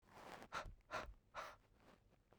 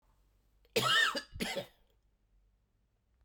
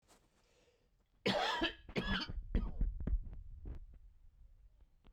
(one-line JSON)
{"exhalation_length": "2.4 s", "exhalation_amplitude": 657, "exhalation_signal_mean_std_ratio": 0.55, "cough_length": "3.2 s", "cough_amplitude": 4571, "cough_signal_mean_std_ratio": 0.37, "three_cough_length": "5.1 s", "three_cough_amplitude": 2836, "three_cough_signal_mean_std_ratio": 0.55, "survey_phase": "beta (2021-08-13 to 2022-03-07)", "age": "18-44", "gender": "Male", "wearing_mask": "No", "symptom_cough_any": true, "symptom_shortness_of_breath": true, "symptom_sore_throat": true, "symptom_fatigue": true, "symptom_onset": "5 days", "smoker_status": "Ex-smoker", "respiratory_condition_asthma": false, "respiratory_condition_other": false, "recruitment_source": "Test and Trace", "submission_delay": "2 days", "covid_test_result": "Positive", "covid_test_method": "ePCR"}